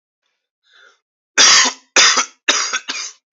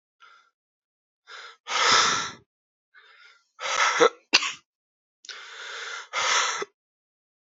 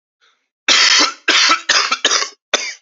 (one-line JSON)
{"three_cough_length": "3.3 s", "three_cough_amplitude": 32768, "three_cough_signal_mean_std_ratio": 0.44, "exhalation_length": "7.4 s", "exhalation_amplitude": 30133, "exhalation_signal_mean_std_ratio": 0.4, "cough_length": "2.8 s", "cough_amplitude": 32768, "cough_signal_mean_std_ratio": 0.6, "survey_phase": "alpha (2021-03-01 to 2021-08-12)", "age": "18-44", "gender": "Male", "wearing_mask": "No", "symptom_new_continuous_cough": true, "symptom_fatigue": true, "symptom_fever_high_temperature": true, "symptom_headache": true, "symptom_change_to_sense_of_smell_or_taste": true, "symptom_loss_of_taste": true, "symptom_onset": "5 days", "smoker_status": "Never smoked", "respiratory_condition_asthma": false, "respiratory_condition_other": false, "recruitment_source": "Test and Trace", "submission_delay": "2 days", "covid_test_result": "Positive", "covid_test_method": "RT-qPCR", "covid_ct_value": 12.8, "covid_ct_gene": "ORF1ab gene", "covid_ct_mean": 13.5, "covid_viral_load": "36000000 copies/ml", "covid_viral_load_category": "High viral load (>1M copies/ml)"}